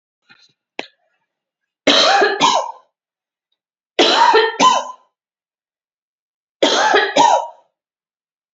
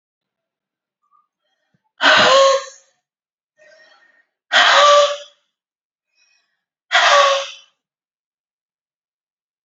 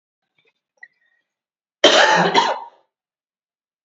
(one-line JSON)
{"three_cough_length": "8.5 s", "three_cough_amplitude": 32767, "three_cough_signal_mean_std_ratio": 0.44, "exhalation_length": "9.6 s", "exhalation_amplitude": 31294, "exhalation_signal_mean_std_ratio": 0.36, "cough_length": "3.8 s", "cough_amplitude": 29688, "cough_signal_mean_std_ratio": 0.34, "survey_phase": "beta (2021-08-13 to 2022-03-07)", "age": "18-44", "gender": "Female", "wearing_mask": "No", "symptom_sore_throat": true, "symptom_diarrhoea": true, "symptom_headache": true, "smoker_status": "Never smoked", "respiratory_condition_asthma": false, "respiratory_condition_other": false, "recruitment_source": "REACT", "submission_delay": "1 day", "covid_test_result": "Positive", "covid_test_method": "RT-qPCR", "covid_ct_value": 27.0, "covid_ct_gene": "E gene"}